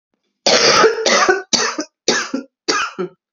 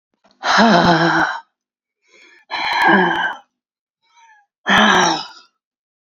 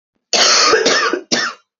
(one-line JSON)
{"three_cough_length": "3.3 s", "three_cough_amplitude": 31228, "three_cough_signal_mean_std_ratio": 0.62, "exhalation_length": "6.1 s", "exhalation_amplitude": 29134, "exhalation_signal_mean_std_ratio": 0.52, "cough_length": "1.8 s", "cough_amplitude": 32767, "cough_signal_mean_std_ratio": 0.72, "survey_phase": "beta (2021-08-13 to 2022-03-07)", "age": "18-44", "gender": "Female", "wearing_mask": "No", "symptom_cough_any": true, "symptom_new_continuous_cough": true, "symptom_runny_or_blocked_nose": true, "symptom_shortness_of_breath": true, "symptom_sore_throat": true, "symptom_fatigue": true, "symptom_fever_high_temperature": true, "symptom_headache": true, "symptom_onset": "2 days", "smoker_status": "Never smoked", "respiratory_condition_asthma": false, "respiratory_condition_other": false, "recruitment_source": "Test and Trace", "submission_delay": "2 days", "covid_test_result": "Positive", "covid_test_method": "RT-qPCR", "covid_ct_value": 27.2, "covid_ct_gene": "ORF1ab gene"}